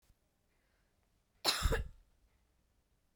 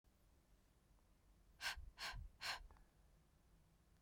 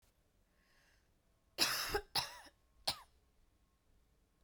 {"cough_length": "3.2 s", "cough_amplitude": 5647, "cough_signal_mean_std_ratio": 0.28, "exhalation_length": "4.0 s", "exhalation_amplitude": 747, "exhalation_signal_mean_std_ratio": 0.46, "three_cough_length": "4.4 s", "three_cough_amplitude": 4416, "three_cough_signal_mean_std_ratio": 0.31, "survey_phase": "beta (2021-08-13 to 2022-03-07)", "age": "18-44", "gender": "Female", "wearing_mask": "Yes", "symptom_cough_any": true, "symptom_runny_or_blocked_nose": true, "symptom_shortness_of_breath": true, "symptom_sore_throat": true, "symptom_fatigue": true, "symptom_headache": true, "symptom_other": true, "symptom_onset": "4 days", "smoker_status": "Never smoked", "respiratory_condition_asthma": false, "respiratory_condition_other": false, "recruitment_source": "Test and Trace", "submission_delay": "1 day", "covid_test_result": "Positive", "covid_test_method": "ePCR"}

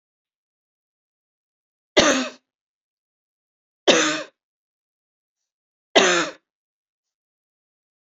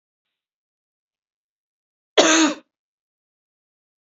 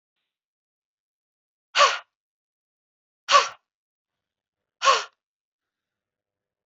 {"three_cough_length": "8.0 s", "three_cough_amplitude": 29016, "three_cough_signal_mean_std_ratio": 0.25, "cough_length": "4.0 s", "cough_amplitude": 28835, "cough_signal_mean_std_ratio": 0.23, "exhalation_length": "6.7 s", "exhalation_amplitude": 23176, "exhalation_signal_mean_std_ratio": 0.22, "survey_phase": "beta (2021-08-13 to 2022-03-07)", "age": "45-64", "gender": "Female", "wearing_mask": "No", "symptom_runny_or_blocked_nose": true, "smoker_status": "Never smoked", "respiratory_condition_asthma": false, "respiratory_condition_other": false, "recruitment_source": "REACT", "submission_delay": "2 days", "covid_test_result": "Negative", "covid_test_method": "RT-qPCR", "influenza_a_test_result": "Unknown/Void", "influenza_b_test_result": "Unknown/Void"}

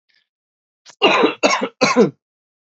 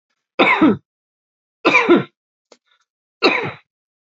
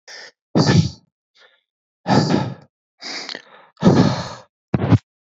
{"cough_length": "2.6 s", "cough_amplitude": 27921, "cough_signal_mean_std_ratio": 0.44, "three_cough_length": "4.2 s", "three_cough_amplitude": 32767, "three_cough_signal_mean_std_ratio": 0.38, "exhalation_length": "5.2 s", "exhalation_amplitude": 28043, "exhalation_signal_mean_std_ratio": 0.43, "survey_phase": "alpha (2021-03-01 to 2021-08-12)", "age": "18-44", "gender": "Male", "wearing_mask": "No", "symptom_none": true, "smoker_status": "Ex-smoker", "respiratory_condition_asthma": false, "respiratory_condition_other": false, "recruitment_source": "REACT", "submission_delay": "1 day", "covid_test_result": "Negative", "covid_test_method": "RT-qPCR"}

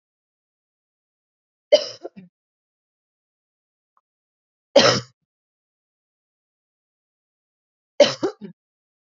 {"three_cough_length": "9.0 s", "three_cough_amplitude": 28162, "three_cough_signal_mean_std_ratio": 0.18, "survey_phase": "beta (2021-08-13 to 2022-03-07)", "age": "18-44", "gender": "Female", "wearing_mask": "No", "symptom_cough_any": true, "symptom_runny_or_blocked_nose": true, "symptom_fatigue": true, "symptom_fever_high_temperature": true, "symptom_headache": true, "smoker_status": "Never smoked", "respiratory_condition_asthma": false, "respiratory_condition_other": false, "recruitment_source": "Test and Trace", "submission_delay": "1 day", "covid_test_result": "Positive", "covid_test_method": "RT-qPCR"}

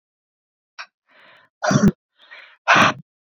{"exhalation_length": "3.3 s", "exhalation_amplitude": 32422, "exhalation_signal_mean_std_ratio": 0.33, "survey_phase": "beta (2021-08-13 to 2022-03-07)", "age": "18-44", "gender": "Female", "wearing_mask": "No", "symptom_cough_any": true, "symptom_runny_or_blocked_nose": true, "symptom_fatigue": true, "symptom_headache": true, "symptom_loss_of_taste": true, "symptom_onset": "4 days", "smoker_status": "Ex-smoker", "respiratory_condition_asthma": false, "respiratory_condition_other": false, "recruitment_source": "Test and Trace", "submission_delay": "2 days", "covid_test_result": "Positive", "covid_test_method": "RT-qPCR", "covid_ct_value": 19.4, "covid_ct_gene": "ORF1ab gene"}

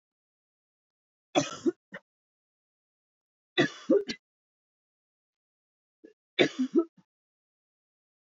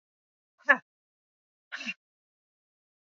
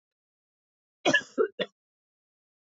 {"three_cough_length": "8.3 s", "three_cough_amplitude": 12714, "three_cough_signal_mean_std_ratio": 0.24, "exhalation_length": "3.2 s", "exhalation_amplitude": 18729, "exhalation_signal_mean_std_ratio": 0.14, "cough_length": "2.7 s", "cough_amplitude": 9910, "cough_signal_mean_std_ratio": 0.26, "survey_phase": "beta (2021-08-13 to 2022-03-07)", "age": "18-44", "gender": "Female", "wearing_mask": "No", "symptom_none": true, "smoker_status": "Ex-smoker", "respiratory_condition_asthma": false, "respiratory_condition_other": false, "recruitment_source": "REACT", "submission_delay": "1 day", "covid_test_result": "Negative", "covid_test_method": "RT-qPCR"}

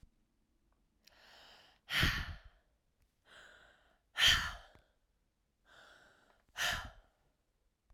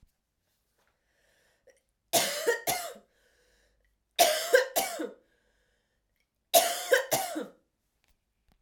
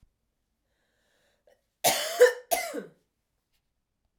{"exhalation_length": "7.9 s", "exhalation_amplitude": 6695, "exhalation_signal_mean_std_ratio": 0.29, "three_cough_length": "8.6 s", "three_cough_amplitude": 15421, "three_cough_signal_mean_std_ratio": 0.35, "cough_length": "4.2 s", "cough_amplitude": 14710, "cough_signal_mean_std_ratio": 0.27, "survey_phase": "beta (2021-08-13 to 2022-03-07)", "age": "18-44", "gender": "Female", "wearing_mask": "No", "symptom_cough_any": true, "symptom_runny_or_blocked_nose": true, "symptom_fatigue": true, "symptom_change_to_sense_of_smell_or_taste": true, "symptom_loss_of_taste": true, "symptom_onset": "6 days", "smoker_status": "Never smoked", "respiratory_condition_asthma": false, "respiratory_condition_other": false, "recruitment_source": "REACT", "submission_delay": "1 day", "covid_test_result": "Positive", "covid_test_method": "RT-qPCR", "covid_ct_value": 22.0, "covid_ct_gene": "E gene"}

